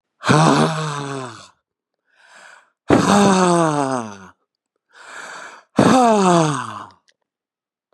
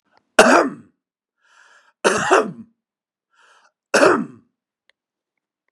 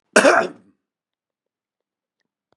exhalation_length: 7.9 s
exhalation_amplitude: 32766
exhalation_signal_mean_std_ratio: 0.48
three_cough_length: 5.7 s
three_cough_amplitude: 32768
three_cough_signal_mean_std_ratio: 0.32
cough_length: 2.6 s
cough_amplitude: 32589
cough_signal_mean_std_ratio: 0.26
survey_phase: beta (2021-08-13 to 2022-03-07)
age: 45-64
gender: Male
wearing_mask: 'No'
symptom_runny_or_blocked_nose: true
symptom_fatigue: true
symptom_onset: 8 days
smoker_status: Ex-smoker
respiratory_condition_asthma: false
respiratory_condition_other: false
recruitment_source: REACT
submission_delay: 2 days
covid_test_result: Negative
covid_test_method: RT-qPCR
influenza_a_test_result: Negative
influenza_b_test_result: Negative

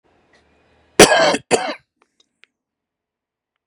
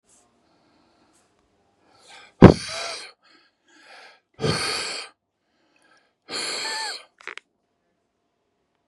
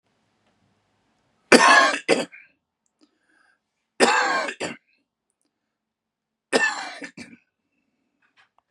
cough_length: 3.7 s
cough_amplitude: 32768
cough_signal_mean_std_ratio: 0.27
exhalation_length: 8.9 s
exhalation_amplitude: 32768
exhalation_signal_mean_std_ratio: 0.2
three_cough_length: 8.7 s
three_cough_amplitude: 32711
three_cough_signal_mean_std_ratio: 0.3
survey_phase: beta (2021-08-13 to 2022-03-07)
age: 45-64
gender: Male
wearing_mask: 'No'
symptom_headache: true
smoker_status: Never smoked
respiratory_condition_asthma: false
respiratory_condition_other: false
recruitment_source: Test and Trace
submission_delay: 2 days
covid_test_result: Positive
covid_test_method: RT-qPCR
covid_ct_value: 28.5
covid_ct_gene: S gene
covid_ct_mean: 28.7
covid_viral_load: 380 copies/ml
covid_viral_load_category: Minimal viral load (< 10K copies/ml)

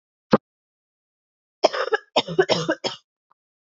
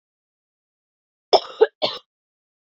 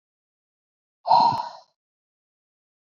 three_cough_length: 3.8 s
three_cough_amplitude: 27456
three_cough_signal_mean_std_ratio: 0.31
cough_length: 2.7 s
cough_amplitude: 27885
cough_signal_mean_std_ratio: 0.2
exhalation_length: 2.8 s
exhalation_amplitude: 16345
exhalation_signal_mean_std_ratio: 0.29
survey_phase: beta (2021-08-13 to 2022-03-07)
age: 18-44
gender: Female
wearing_mask: 'No'
symptom_cough_any: true
symptom_new_continuous_cough: true
symptom_runny_or_blocked_nose: true
symptom_sore_throat: true
symptom_headache: true
symptom_other: true
symptom_onset: 4 days
smoker_status: Never smoked
respiratory_condition_asthma: false
respiratory_condition_other: false
recruitment_source: Test and Trace
submission_delay: 1 day
covid_test_result: Positive
covid_test_method: RT-qPCR
covid_ct_value: 33.8
covid_ct_gene: ORF1ab gene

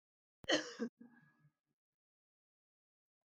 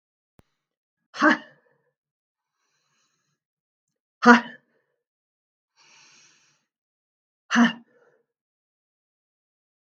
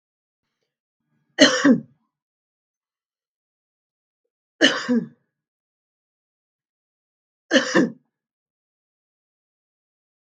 cough_length: 3.3 s
cough_amplitude: 2809
cough_signal_mean_std_ratio: 0.22
exhalation_length: 9.9 s
exhalation_amplitude: 32064
exhalation_signal_mean_std_ratio: 0.17
three_cough_length: 10.2 s
three_cough_amplitude: 32768
three_cough_signal_mean_std_ratio: 0.23
survey_phase: beta (2021-08-13 to 2022-03-07)
age: 45-64
gender: Female
wearing_mask: 'No'
symptom_none: true
smoker_status: Never smoked
respiratory_condition_asthma: true
respiratory_condition_other: false
recruitment_source: REACT
submission_delay: 2 days
covid_test_result: Negative
covid_test_method: RT-qPCR
influenza_a_test_result: Negative
influenza_b_test_result: Negative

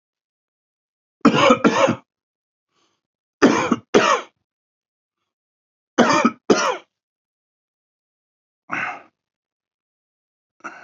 three_cough_length: 10.8 s
three_cough_amplitude: 29363
three_cough_signal_mean_std_ratio: 0.32
survey_phase: beta (2021-08-13 to 2022-03-07)
age: 45-64
gender: Male
wearing_mask: 'No'
symptom_cough_any: true
symptom_shortness_of_breath: true
symptom_sore_throat: true
symptom_fatigue: true
symptom_headache: true
smoker_status: Never smoked
respiratory_condition_asthma: true
respiratory_condition_other: false
recruitment_source: Test and Trace
submission_delay: 1 day
covid_test_result: Positive
covid_test_method: RT-qPCR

